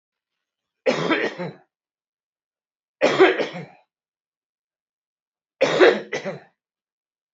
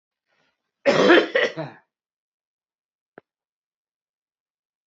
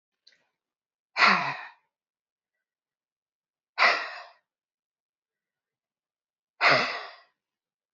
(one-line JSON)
{"three_cough_length": "7.3 s", "three_cough_amplitude": 27313, "three_cough_signal_mean_std_ratio": 0.33, "cough_length": "4.9 s", "cough_amplitude": 32767, "cough_signal_mean_std_ratio": 0.27, "exhalation_length": "7.9 s", "exhalation_amplitude": 17422, "exhalation_signal_mean_std_ratio": 0.27, "survey_phase": "beta (2021-08-13 to 2022-03-07)", "age": "45-64", "gender": "Male", "wearing_mask": "No", "symptom_cough_any": true, "symptom_new_continuous_cough": true, "symptom_runny_or_blocked_nose": true, "symptom_shortness_of_breath": true, "symptom_sore_throat": true, "symptom_fatigue": true, "smoker_status": "Ex-smoker", "respiratory_condition_asthma": false, "respiratory_condition_other": false, "recruitment_source": "Test and Trace", "submission_delay": "1 day", "covid_test_result": "Positive", "covid_test_method": "RT-qPCR", "covid_ct_value": 16.6, "covid_ct_gene": "N gene"}